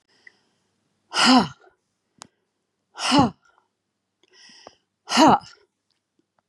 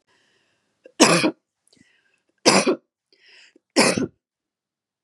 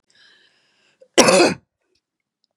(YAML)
exhalation_length: 6.5 s
exhalation_amplitude: 25485
exhalation_signal_mean_std_ratio: 0.29
three_cough_length: 5.0 s
three_cough_amplitude: 32767
three_cough_signal_mean_std_ratio: 0.32
cough_length: 2.6 s
cough_amplitude: 32768
cough_signal_mean_std_ratio: 0.3
survey_phase: beta (2021-08-13 to 2022-03-07)
age: 45-64
gender: Female
wearing_mask: 'No'
symptom_none: true
smoker_status: Never smoked
respiratory_condition_asthma: false
respiratory_condition_other: false
recruitment_source: Test and Trace
submission_delay: 1 day
covid_test_result: Negative
covid_test_method: RT-qPCR